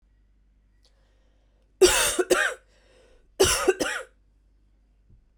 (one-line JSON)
{"cough_length": "5.4 s", "cough_amplitude": 18679, "cough_signal_mean_std_ratio": 0.35, "survey_phase": "beta (2021-08-13 to 2022-03-07)", "age": "18-44", "gender": "Female", "wearing_mask": "No", "symptom_cough_any": true, "symptom_runny_or_blocked_nose": true, "symptom_shortness_of_breath": true, "symptom_other": true, "smoker_status": "Ex-smoker", "respiratory_condition_asthma": true, "respiratory_condition_other": false, "recruitment_source": "Test and Trace", "submission_delay": "1 day", "covid_test_result": "Positive", "covid_test_method": "ePCR"}